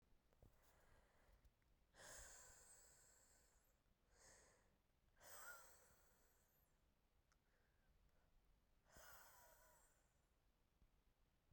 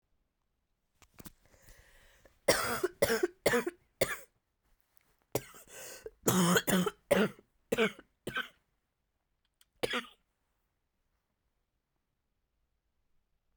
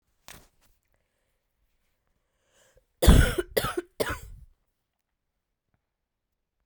{
  "exhalation_length": "11.5 s",
  "exhalation_amplitude": 139,
  "exhalation_signal_mean_std_ratio": 0.66,
  "three_cough_length": "13.6 s",
  "three_cough_amplitude": 10265,
  "three_cough_signal_mean_std_ratio": 0.32,
  "cough_length": "6.7 s",
  "cough_amplitude": 21527,
  "cough_signal_mean_std_ratio": 0.22,
  "survey_phase": "beta (2021-08-13 to 2022-03-07)",
  "age": "18-44",
  "gender": "Female",
  "wearing_mask": "No",
  "symptom_cough_any": true,
  "symptom_new_continuous_cough": true,
  "symptom_runny_or_blocked_nose": true,
  "symptom_sore_throat": true,
  "symptom_fatigue": true,
  "symptom_headache": true,
  "symptom_onset": "7 days",
  "smoker_status": "Current smoker (e-cigarettes or vapes only)",
  "respiratory_condition_asthma": true,
  "respiratory_condition_other": false,
  "recruitment_source": "Test and Trace",
  "submission_delay": "2 days",
  "covid_test_result": "Positive",
  "covid_test_method": "RT-qPCR",
  "covid_ct_value": 14.4,
  "covid_ct_gene": "ORF1ab gene",
  "covid_ct_mean": 14.9,
  "covid_viral_load": "13000000 copies/ml",
  "covid_viral_load_category": "High viral load (>1M copies/ml)"
}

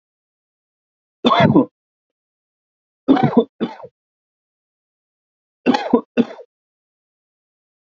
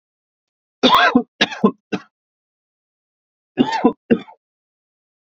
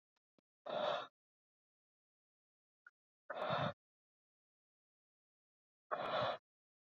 {
  "three_cough_length": "7.9 s",
  "three_cough_amplitude": 27676,
  "three_cough_signal_mean_std_ratio": 0.29,
  "cough_length": "5.2 s",
  "cough_amplitude": 30475,
  "cough_signal_mean_std_ratio": 0.32,
  "exhalation_length": "6.8 s",
  "exhalation_amplitude": 1801,
  "exhalation_signal_mean_std_ratio": 0.34,
  "survey_phase": "beta (2021-08-13 to 2022-03-07)",
  "age": "18-44",
  "gender": "Male",
  "wearing_mask": "No",
  "symptom_none": true,
  "smoker_status": "Ex-smoker",
  "respiratory_condition_asthma": false,
  "respiratory_condition_other": false,
  "recruitment_source": "REACT",
  "submission_delay": "1 day",
  "covid_test_result": "Negative",
  "covid_test_method": "RT-qPCR",
  "influenza_a_test_result": "Negative",
  "influenza_b_test_result": "Negative"
}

